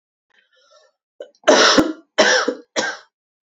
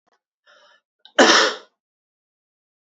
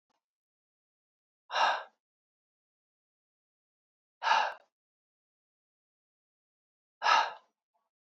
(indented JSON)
{
  "three_cough_length": "3.5 s",
  "three_cough_amplitude": 30175,
  "three_cough_signal_mean_std_ratio": 0.41,
  "cough_length": "3.0 s",
  "cough_amplitude": 31433,
  "cough_signal_mean_std_ratio": 0.27,
  "exhalation_length": "8.0 s",
  "exhalation_amplitude": 8314,
  "exhalation_signal_mean_std_ratio": 0.25,
  "survey_phase": "alpha (2021-03-01 to 2021-08-12)",
  "age": "18-44",
  "gender": "Female",
  "wearing_mask": "No",
  "symptom_cough_any": true,
  "symptom_fatigue": true,
  "symptom_fever_high_temperature": true,
  "symptom_headache": true,
  "smoker_status": "Never smoked",
  "respiratory_condition_asthma": false,
  "respiratory_condition_other": false,
  "recruitment_source": "Test and Trace",
  "submission_delay": "1 day",
  "covid_test_result": "Positive",
  "covid_test_method": "RT-qPCR",
  "covid_ct_value": 14.5,
  "covid_ct_gene": "ORF1ab gene",
  "covid_ct_mean": 14.8,
  "covid_viral_load": "14000000 copies/ml",
  "covid_viral_load_category": "High viral load (>1M copies/ml)"
}